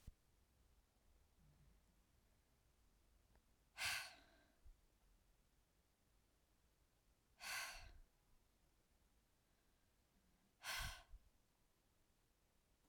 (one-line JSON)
{"exhalation_length": "12.9 s", "exhalation_amplitude": 727, "exhalation_signal_mean_std_ratio": 0.33, "survey_phase": "alpha (2021-03-01 to 2021-08-12)", "age": "45-64", "gender": "Female", "wearing_mask": "No", "symptom_cough_any": true, "symptom_diarrhoea": true, "symptom_fatigue": true, "smoker_status": "Never smoked", "respiratory_condition_asthma": false, "respiratory_condition_other": false, "recruitment_source": "Test and Trace", "submission_delay": "1 day", "covid_test_result": "Positive", "covid_test_method": "RT-qPCR", "covid_ct_value": 18.7, "covid_ct_gene": "ORF1ab gene", "covid_ct_mean": 19.7, "covid_viral_load": "340000 copies/ml", "covid_viral_load_category": "Low viral load (10K-1M copies/ml)"}